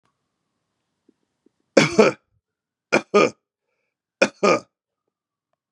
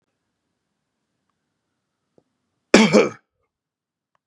{"three_cough_length": "5.7 s", "three_cough_amplitude": 32550, "three_cough_signal_mean_std_ratio": 0.26, "cough_length": "4.3 s", "cough_amplitude": 32768, "cough_signal_mean_std_ratio": 0.21, "survey_phase": "beta (2021-08-13 to 2022-03-07)", "age": "45-64", "gender": "Male", "wearing_mask": "No", "symptom_none": true, "smoker_status": "Current smoker (1 to 10 cigarettes per day)", "respiratory_condition_asthma": false, "respiratory_condition_other": false, "recruitment_source": "REACT", "submission_delay": "2 days", "covid_test_result": "Negative", "covid_test_method": "RT-qPCR", "influenza_a_test_result": "Negative", "influenza_b_test_result": "Negative"}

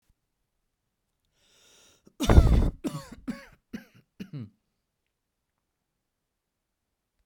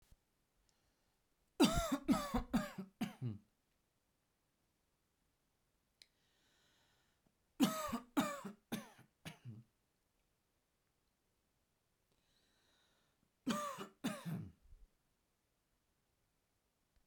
{"cough_length": "7.3 s", "cough_amplitude": 24478, "cough_signal_mean_std_ratio": 0.22, "three_cough_length": "17.1 s", "three_cough_amplitude": 4210, "three_cough_signal_mean_std_ratio": 0.29, "survey_phase": "beta (2021-08-13 to 2022-03-07)", "age": "45-64", "gender": "Male", "wearing_mask": "No", "symptom_fatigue": true, "symptom_onset": "3 days", "smoker_status": "Ex-smoker", "respiratory_condition_asthma": true, "respiratory_condition_other": false, "recruitment_source": "REACT", "submission_delay": "1 day", "covid_test_result": "Negative", "covid_test_method": "RT-qPCR"}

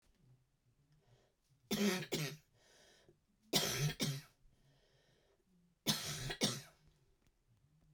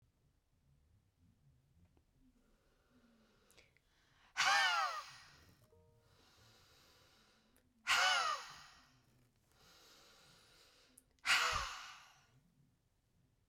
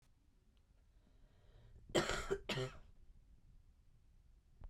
{"three_cough_length": "7.9 s", "three_cough_amplitude": 3471, "three_cough_signal_mean_std_ratio": 0.4, "exhalation_length": "13.5 s", "exhalation_amplitude": 3267, "exhalation_signal_mean_std_ratio": 0.31, "cough_length": "4.7 s", "cough_amplitude": 3402, "cough_signal_mean_std_ratio": 0.38, "survey_phase": "beta (2021-08-13 to 2022-03-07)", "age": "45-64", "gender": "Female", "wearing_mask": "No", "symptom_cough_any": true, "symptom_sore_throat": true, "symptom_onset": "4 days", "smoker_status": "Ex-smoker", "respiratory_condition_asthma": false, "respiratory_condition_other": false, "recruitment_source": "Test and Trace", "submission_delay": "2 days", "covid_test_result": "Positive", "covid_test_method": "RT-qPCR", "covid_ct_value": 19.0, "covid_ct_gene": "ORF1ab gene", "covid_ct_mean": 19.1, "covid_viral_load": "540000 copies/ml", "covid_viral_load_category": "Low viral load (10K-1M copies/ml)"}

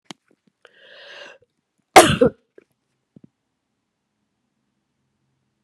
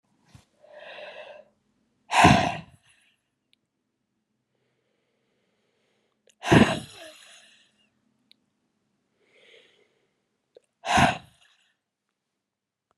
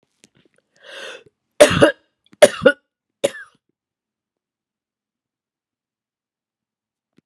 {"cough_length": "5.6 s", "cough_amplitude": 32768, "cough_signal_mean_std_ratio": 0.17, "exhalation_length": "13.0 s", "exhalation_amplitude": 25189, "exhalation_signal_mean_std_ratio": 0.22, "three_cough_length": "7.3 s", "three_cough_amplitude": 32768, "three_cough_signal_mean_std_ratio": 0.19, "survey_phase": "beta (2021-08-13 to 2022-03-07)", "age": "65+", "gender": "Female", "wearing_mask": "No", "symptom_cough_any": true, "symptom_runny_or_blocked_nose": true, "symptom_fatigue": true, "symptom_fever_high_temperature": true, "symptom_change_to_sense_of_smell_or_taste": true, "symptom_loss_of_taste": true, "symptom_onset": "3 days", "smoker_status": "Never smoked", "respiratory_condition_asthma": false, "respiratory_condition_other": false, "recruitment_source": "Test and Trace", "submission_delay": "1 day", "covid_test_result": "Positive", "covid_test_method": "RT-qPCR", "covid_ct_value": 16.8, "covid_ct_gene": "N gene", "covid_ct_mean": 17.2, "covid_viral_load": "2400000 copies/ml", "covid_viral_load_category": "High viral load (>1M copies/ml)"}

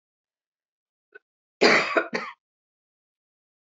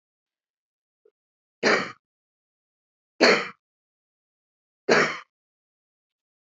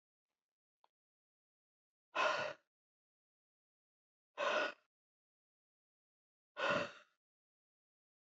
{"cough_length": "3.8 s", "cough_amplitude": 25205, "cough_signal_mean_std_ratio": 0.27, "three_cough_length": "6.6 s", "three_cough_amplitude": 22056, "three_cough_signal_mean_std_ratio": 0.25, "exhalation_length": "8.3 s", "exhalation_amplitude": 2552, "exhalation_signal_mean_std_ratio": 0.28, "survey_phase": "beta (2021-08-13 to 2022-03-07)", "age": "65+", "gender": "Female", "wearing_mask": "No", "symptom_none": true, "smoker_status": "Never smoked", "respiratory_condition_asthma": false, "respiratory_condition_other": false, "recruitment_source": "Test and Trace", "submission_delay": "2 days", "covid_test_result": "Positive", "covid_test_method": "ePCR"}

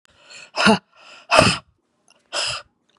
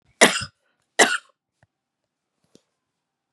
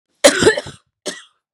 {"exhalation_length": "3.0 s", "exhalation_amplitude": 32768, "exhalation_signal_mean_std_ratio": 0.36, "three_cough_length": "3.3 s", "three_cough_amplitude": 32748, "three_cough_signal_mean_std_ratio": 0.22, "cough_length": "1.5 s", "cough_amplitude": 32768, "cough_signal_mean_std_ratio": 0.37, "survey_phase": "beta (2021-08-13 to 2022-03-07)", "age": "45-64", "gender": "Female", "wearing_mask": "No", "symptom_cough_any": true, "symptom_runny_or_blocked_nose": true, "symptom_onset": "11 days", "smoker_status": "Never smoked", "respiratory_condition_asthma": false, "respiratory_condition_other": false, "recruitment_source": "REACT", "submission_delay": "1 day", "covid_test_result": "Negative", "covid_test_method": "RT-qPCR", "influenza_a_test_result": "Negative", "influenza_b_test_result": "Negative"}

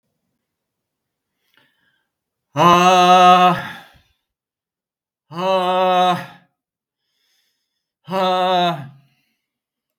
{"exhalation_length": "10.0 s", "exhalation_amplitude": 32768, "exhalation_signal_mean_std_ratio": 0.43, "survey_phase": "beta (2021-08-13 to 2022-03-07)", "age": "65+", "gender": "Male", "wearing_mask": "No", "symptom_none": true, "smoker_status": "Ex-smoker", "respiratory_condition_asthma": false, "respiratory_condition_other": false, "recruitment_source": "REACT", "submission_delay": "5 days", "covid_test_result": "Negative", "covid_test_method": "RT-qPCR", "influenza_a_test_result": "Unknown/Void", "influenza_b_test_result": "Unknown/Void"}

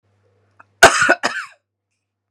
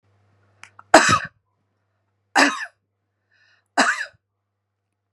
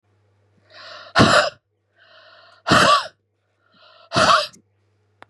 {"cough_length": "2.3 s", "cough_amplitude": 32768, "cough_signal_mean_std_ratio": 0.3, "three_cough_length": "5.1 s", "three_cough_amplitude": 32768, "three_cough_signal_mean_std_ratio": 0.27, "exhalation_length": "5.3 s", "exhalation_amplitude": 32109, "exhalation_signal_mean_std_ratio": 0.37, "survey_phase": "beta (2021-08-13 to 2022-03-07)", "age": "45-64", "gender": "Female", "wearing_mask": "No", "symptom_none": true, "smoker_status": "Never smoked", "respiratory_condition_asthma": false, "respiratory_condition_other": false, "recruitment_source": "REACT", "submission_delay": "2 days", "covid_test_result": "Negative", "covid_test_method": "RT-qPCR", "influenza_a_test_result": "Negative", "influenza_b_test_result": "Negative"}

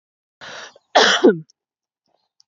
{"cough_length": "2.5 s", "cough_amplitude": 28501, "cough_signal_mean_std_ratio": 0.32, "survey_phase": "beta (2021-08-13 to 2022-03-07)", "age": "18-44", "gender": "Female", "wearing_mask": "No", "symptom_none": true, "symptom_onset": "3 days", "smoker_status": "Never smoked", "respiratory_condition_asthma": false, "respiratory_condition_other": false, "recruitment_source": "REACT", "submission_delay": "2 days", "covid_test_result": "Negative", "covid_test_method": "RT-qPCR", "influenza_a_test_result": "Negative", "influenza_b_test_result": "Negative"}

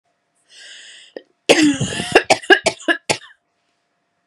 {"cough_length": "4.3 s", "cough_amplitude": 32768, "cough_signal_mean_std_ratio": 0.35, "survey_phase": "beta (2021-08-13 to 2022-03-07)", "age": "18-44", "gender": "Female", "wearing_mask": "No", "symptom_cough_any": true, "symptom_runny_or_blocked_nose": true, "symptom_sore_throat": true, "symptom_fatigue": true, "symptom_headache": true, "symptom_change_to_sense_of_smell_or_taste": true, "smoker_status": "Never smoked", "respiratory_condition_asthma": true, "respiratory_condition_other": false, "recruitment_source": "Test and Trace", "submission_delay": "2 days", "covid_test_result": "Positive", "covid_test_method": "RT-qPCR", "covid_ct_value": 19.9, "covid_ct_gene": "ORF1ab gene", "covid_ct_mean": 20.3, "covid_viral_load": "230000 copies/ml", "covid_viral_load_category": "Low viral load (10K-1M copies/ml)"}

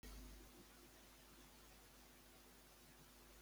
{"three_cough_length": "3.4 s", "three_cough_amplitude": 164, "three_cough_signal_mean_std_ratio": 1.1, "survey_phase": "beta (2021-08-13 to 2022-03-07)", "age": "45-64", "gender": "Male", "wearing_mask": "No", "symptom_none": true, "smoker_status": "Never smoked", "respiratory_condition_asthma": false, "respiratory_condition_other": false, "recruitment_source": "REACT", "submission_delay": "2 days", "covid_test_result": "Negative", "covid_test_method": "RT-qPCR", "influenza_a_test_result": "Negative", "influenza_b_test_result": "Negative"}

